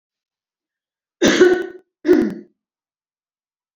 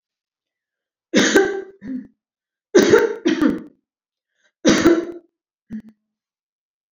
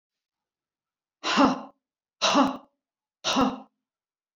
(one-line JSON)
{"cough_length": "3.8 s", "cough_amplitude": 28165, "cough_signal_mean_std_ratio": 0.35, "three_cough_length": "6.9 s", "three_cough_amplitude": 29152, "three_cough_signal_mean_std_ratio": 0.39, "exhalation_length": "4.4 s", "exhalation_amplitude": 15366, "exhalation_signal_mean_std_ratio": 0.37, "survey_phase": "beta (2021-08-13 to 2022-03-07)", "age": "65+", "gender": "Female", "wearing_mask": "No", "symptom_none": true, "smoker_status": "Never smoked", "respiratory_condition_asthma": false, "respiratory_condition_other": false, "recruitment_source": "REACT", "submission_delay": "1 day", "covid_test_result": "Negative", "covid_test_method": "RT-qPCR"}